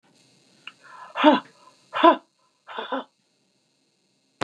{"exhalation_length": "4.4 s", "exhalation_amplitude": 27140, "exhalation_signal_mean_std_ratio": 0.26, "survey_phase": "beta (2021-08-13 to 2022-03-07)", "age": "65+", "gender": "Female", "wearing_mask": "No", "symptom_none": true, "smoker_status": "Never smoked", "respiratory_condition_asthma": false, "respiratory_condition_other": false, "recruitment_source": "REACT", "submission_delay": "2 days", "covid_test_result": "Negative", "covid_test_method": "RT-qPCR", "influenza_a_test_result": "Negative", "influenza_b_test_result": "Negative"}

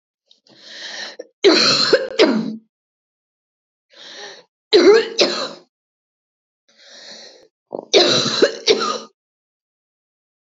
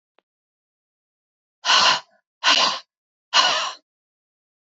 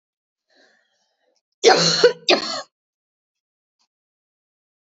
{"three_cough_length": "10.4 s", "three_cough_amplitude": 31636, "three_cough_signal_mean_std_ratio": 0.4, "exhalation_length": "4.7 s", "exhalation_amplitude": 26229, "exhalation_signal_mean_std_ratio": 0.37, "cough_length": "4.9 s", "cough_amplitude": 32767, "cough_signal_mean_std_ratio": 0.28, "survey_phase": "beta (2021-08-13 to 2022-03-07)", "age": "45-64", "gender": "Female", "wearing_mask": "No", "symptom_none": true, "smoker_status": "Never smoked", "respiratory_condition_asthma": false, "respiratory_condition_other": false, "recruitment_source": "Test and Trace", "submission_delay": "1 day", "covid_test_result": "Positive", "covid_test_method": "LFT"}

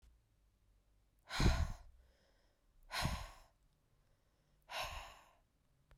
{"exhalation_length": "6.0 s", "exhalation_amplitude": 3346, "exhalation_signal_mean_std_ratio": 0.32, "survey_phase": "beta (2021-08-13 to 2022-03-07)", "age": "18-44", "gender": "Female", "wearing_mask": "No", "symptom_runny_or_blocked_nose": true, "symptom_sore_throat": true, "smoker_status": "Never smoked", "respiratory_condition_asthma": false, "respiratory_condition_other": false, "recruitment_source": "Test and Trace", "submission_delay": "2 days", "covid_test_result": "Positive", "covid_test_method": "RT-qPCR", "covid_ct_value": 20.3, "covid_ct_gene": "ORF1ab gene"}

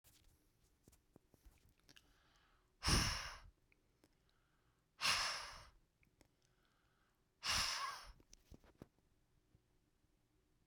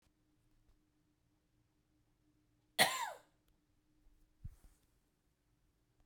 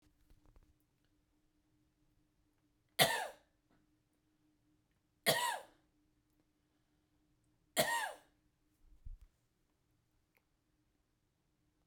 {"exhalation_length": "10.7 s", "exhalation_amplitude": 2361, "exhalation_signal_mean_std_ratio": 0.31, "cough_length": "6.1 s", "cough_amplitude": 6574, "cough_signal_mean_std_ratio": 0.18, "three_cough_length": "11.9 s", "three_cough_amplitude": 8124, "three_cough_signal_mean_std_ratio": 0.23, "survey_phase": "beta (2021-08-13 to 2022-03-07)", "age": "45-64", "gender": "Female", "wearing_mask": "No", "symptom_none": true, "smoker_status": "Current smoker (e-cigarettes or vapes only)", "respiratory_condition_asthma": false, "respiratory_condition_other": false, "recruitment_source": "REACT", "submission_delay": "2 days", "covid_test_result": "Negative", "covid_test_method": "RT-qPCR"}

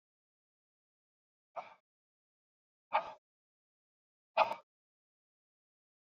{"exhalation_length": "6.1 s", "exhalation_amplitude": 5239, "exhalation_signal_mean_std_ratio": 0.16, "survey_phase": "beta (2021-08-13 to 2022-03-07)", "age": "45-64", "gender": "Male", "wearing_mask": "No", "symptom_cough_any": true, "symptom_runny_or_blocked_nose": true, "symptom_onset": "3 days", "smoker_status": "Never smoked", "respiratory_condition_asthma": false, "respiratory_condition_other": false, "recruitment_source": "Test and Trace", "submission_delay": "1 day", "covid_test_result": "Positive", "covid_test_method": "RT-qPCR", "covid_ct_value": 22.2, "covid_ct_gene": "ORF1ab gene", "covid_ct_mean": 23.0, "covid_viral_load": "29000 copies/ml", "covid_viral_load_category": "Low viral load (10K-1M copies/ml)"}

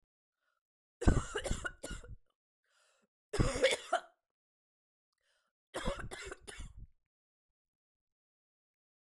{"three_cough_length": "9.1 s", "three_cough_amplitude": 7816, "three_cough_signal_mean_std_ratio": 0.29, "survey_phase": "beta (2021-08-13 to 2022-03-07)", "age": "18-44", "gender": "Female", "wearing_mask": "No", "symptom_fatigue": true, "symptom_headache": true, "symptom_change_to_sense_of_smell_or_taste": true, "symptom_loss_of_taste": true, "symptom_other": true, "symptom_onset": "5 days", "smoker_status": "Never smoked", "respiratory_condition_asthma": false, "respiratory_condition_other": false, "recruitment_source": "Test and Trace", "submission_delay": "2 days", "covid_test_result": "Positive", "covid_test_method": "RT-qPCR", "covid_ct_value": 13.4, "covid_ct_gene": "N gene", "covid_ct_mean": 13.8, "covid_viral_load": "30000000 copies/ml", "covid_viral_load_category": "High viral load (>1M copies/ml)"}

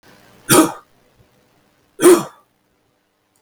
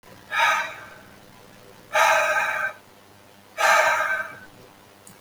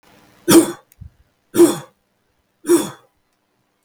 {"cough_length": "3.4 s", "cough_amplitude": 32768, "cough_signal_mean_std_ratio": 0.29, "exhalation_length": "5.2 s", "exhalation_amplitude": 18107, "exhalation_signal_mean_std_ratio": 0.54, "three_cough_length": "3.8 s", "three_cough_amplitude": 32768, "three_cough_signal_mean_std_ratio": 0.31, "survey_phase": "beta (2021-08-13 to 2022-03-07)", "age": "45-64", "gender": "Male", "wearing_mask": "No", "symptom_none": true, "smoker_status": "Never smoked", "respiratory_condition_asthma": false, "respiratory_condition_other": false, "recruitment_source": "Test and Trace", "submission_delay": "1 day", "covid_test_result": "Positive", "covid_test_method": "LFT"}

